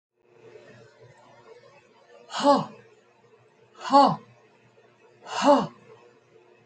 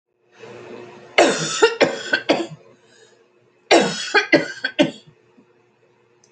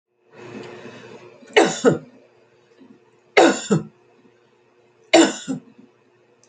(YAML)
exhalation_length: 6.7 s
exhalation_amplitude: 18813
exhalation_signal_mean_std_ratio: 0.29
cough_length: 6.3 s
cough_amplitude: 31476
cough_signal_mean_std_ratio: 0.4
three_cough_length: 6.5 s
three_cough_amplitude: 32768
three_cough_signal_mean_std_ratio: 0.32
survey_phase: alpha (2021-03-01 to 2021-08-12)
age: 65+
gender: Female
wearing_mask: 'No'
symptom_none: true
smoker_status: Prefer not to say
respiratory_condition_asthma: false
respiratory_condition_other: false
recruitment_source: REACT
submission_delay: 6 days
covid_test_result: Negative
covid_test_method: RT-qPCR